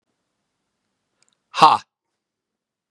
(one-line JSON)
{"exhalation_length": "2.9 s", "exhalation_amplitude": 32768, "exhalation_signal_mean_std_ratio": 0.19, "survey_phase": "beta (2021-08-13 to 2022-03-07)", "age": "45-64", "gender": "Male", "wearing_mask": "No", "symptom_runny_or_blocked_nose": true, "smoker_status": "Never smoked", "respiratory_condition_asthma": false, "respiratory_condition_other": false, "recruitment_source": "REACT", "submission_delay": "1 day", "covid_test_result": "Negative", "covid_test_method": "RT-qPCR", "influenza_a_test_result": "Negative", "influenza_b_test_result": "Negative"}